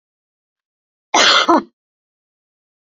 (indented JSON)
{
  "cough_length": "3.0 s",
  "cough_amplitude": 29872,
  "cough_signal_mean_std_ratio": 0.31,
  "survey_phase": "beta (2021-08-13 to 2022-03-07)",
  "age": "45-64",
  "gender": "Female",
  "wearing_mask": "No",
  "symptom_cough_any": true,
  "symptom_fatigue": true,
  "symptom_headache": true,
  "symptom_loss_of_taste": true,
  "smoker_status": "Never smoked",
  "respiratory_condition_asthma": false,
  "respiratory_condition_other": false,
  "recruitment_source": "Test and Trace",
  "submission_delay": "2 days",
  "covid_test_result": "Positive",
  "covid_test_method": "RT-qPCR",
  "covid_ct_value": 16.2,
  "covid_ct_gene": "ORF1ab gene",
  "covid_ct_mean": 16.4,
  "covid_viral_load": "4300000 copies/ml",
  "covid_viral_load_category": "High viral load (>1M copies/ml)"
}